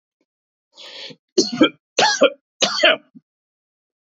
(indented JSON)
{
  "three_cough_length": "4.0 s",
  "three_cough_amplitude": 32636,
  "three_cough_signal_mean_std_ratio": 0.36,
  "survey_phase": "beta (2021-08-13 to 2022-03-07)",
  "age": "18-44",
  "gender": "Male",
  "wearing_mask": "No",
  "symptom_cough_any": true,
  "symptom_runny_or_blocked_nose": true,
  "symptom_sore_throat": true,
  "symptom_fatigue": true,
  "symptom_headache": true,
  "symptom_change_to_sense_of_smell_or_taste": true,
  "symptom_onset": "3 days",
  "smoker_status": "Never smoked",
  "respiratory_condition_asthma": false,
  "respiratory_condition_other": false,
  "recruitment_source": "Test and Trace",
  "submission_delay": "1 day",
  "covid_test_method": "ePCR"
}